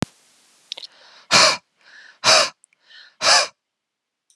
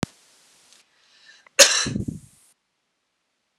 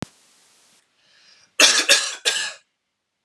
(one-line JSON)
{"exhalation_length": "4.4 s", "exhalation_amplitude": 31050, "exhalation_signal_mean_std_ratio": 0.34, "cough_length": "3.6 s", "cough_amplitude": 32768, "cough_signal_mean_std_ratio": 0.24, "three_cough_length": "3.2 s", "three_cough_amplitude": 32533, "three_cough_signal_mean_std_ratio": 0.35, "survey_phase": "beta (2021-08-13 to 2022-03-07)", "age": "18-44", "gender": "Male", "wearing_mask": "No", "symptom_none": true, "smoker_status": "Never smoked", "respiratory_condition_asthma": false, "respiratory_condition_other": false, "recruitment_source": "REACT", "submission_delay": "0 days", "covid_test_result": "Negative", "covid_test_method": "RT-qPCR"}